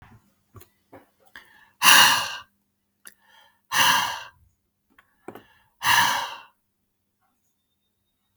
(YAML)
exhalation_length: 8.4 s
exhalation_amplitude: 32768
exhalation_signal_mean_std_ratio: 0.31
survey_phase: beta (2021-08-13 to 2022-03-07)
age: 45-64
gender: Male
wearing_mask: 'No'
symptom_none: true
smoker_status: Ex-smoker
respiratory_condition_asthma: false
respiratory_condition_other: false
recruitment_source: Test and Trace
submission_delay: 2 days
covid_test_result: Positive
covid_test_method: ePCR